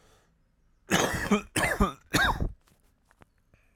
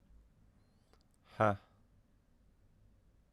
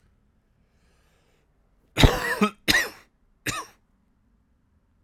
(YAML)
cough_length: 3.8 s
cough_amplitude: 10375
cough_signal_mean_std_ratio: 0.45
exhalation_length: 3.3 s
exhalation_amplitude: 4702
exhalation_signal_mean_std_ratio: 0.2
three_cough_length: 5.0 s
three_cough_amplitude: 32768
three_cough_signal_mean_std_ratio: 0.27
survey_phase: alpha (2021-03-01 to 2021-08-12)
age: 18-44
gender: Male
wearing_mask: 'No'
symptom_cough_any: true
symptom_new_continuous_cough: true
symptom_shortness_of_breath: true
symptom_abdominal_pain: true
symptom_diarrhoea: true
symptom_fatigue: true
symptom_fever_high_temperature: true
symptom_headache: true
symptom_change_to_sense_of_smell_or_taste: true
symptom_loss_of_taste: true
symptom_onset: 2 days
smoker_status: Current smoker (1 to 10 cigarettes per day)
respiratory_condition_asthma: false
respiratory_condition_other: false
recruitment_source: Test and Trace
submission_delay: 1 day
covid_test_result: Positive
covid_test_method: RT-qPCR
covid_ct_value: 19.7
covid_ct_gene: ORF1ab gene
covid_ct_mean: 20.6
covid_viral_load: 180000 copies/ml
covid_viral_load_category: Low viral load (10K-1M copies/ml)